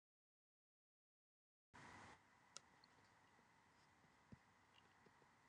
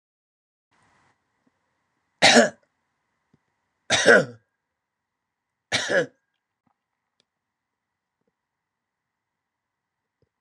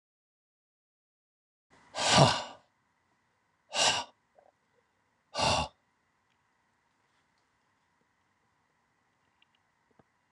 {"cough_length": "5.5 s", "cough_amplitude": 608, "cough_signal_mean_std_ratio": 0.55, "three_cough_length": "10.4 s", "three_cough_amplitude": 26028, "three_cough_signal_mean_std_ratio": 0.21, "exhalation_length": "10.3 s", "exhalation_amplitude": 17125, "exhalation_signal_mean_std_ratio": 0.24, "survey_phase": "beta (2021-08-13 to 2022-03-07)", "age": "65+", "gender": "Male", "wearing_mask": "No", "symptom_none": true, "smoker_status": "Ex-smoker", "respiratory_condition_asthma": false, "respiratory_condition_other": false, "recruitment_source": "REACT", "submission_delay": "2 days", "covid_test_result": "Negative", "covid_test_method": "RT-qPCR"}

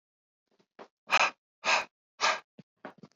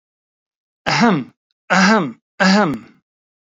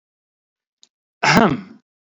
{"exhalation_length": "3.2 s", "exhalation_amplitude": 10888, "exhalation_signal_mean_std_ratio": 0.33, "three_cough_length": "3.6 s", "three_cough_amplitude": 32768, "three_cough_signal_mean_std_ratio": 0.48, "cough_length": "2.1 s", "cough_amplitude": 26862, "cough_signal_mean_std_ratio": 0.32, "survey_phase": "beta (2021-08-13 to 2022-03-07)", "age": "18-44", "gender": "Male", "wearing_mask": "No", "symptom_none": true, "smoker_status": "Never smoked", "respiratory_condition_asthma": false, "respiratory_condition_other": false, "recruitment_source": "REACT", "submission_delay": "2 days", "covid_test_result": "Negative", "covid_test_method": "RT-qPCR"}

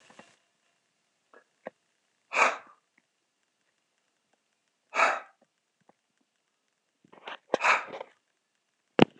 {"exhalation_length": "9.2 s", "exhalation_amplitude": 26027, "exhalation_signal_mean_std_ratio": 0.21, "survey_phase": "beta (2021-08-13 to 2022-03-07)", "age": "45-64", "gender": "Male", "wearing_mask": "No", "symptom_cough_any": true, "symptom_runny_or_blocked_nose": true, "symptom_sore_throat": true, "symptom_headache": true, "symptom_change_to_sense_of_smell_or_taste": true, "symptom_other": true, "symptom_onset": "3 days", "smoker_status": "Never smoked", "respiratory_condition_asthma": false, "respiratory_condition_other": false, "recruitment_source": "Test and Trace", "submission_delay": "2 days", "covid_test_result": "Positive", "covid_test_method": "RT-qPCR", "covid_ct_value": 23.3, "covid_ct_gene": "ORF1ab gene", "covid_ct_mean": 23.7, "covid_viral_load": "17000 copies/ml", "covid_viral_load_category": "Low viral load (10K-1M copies/ml)"}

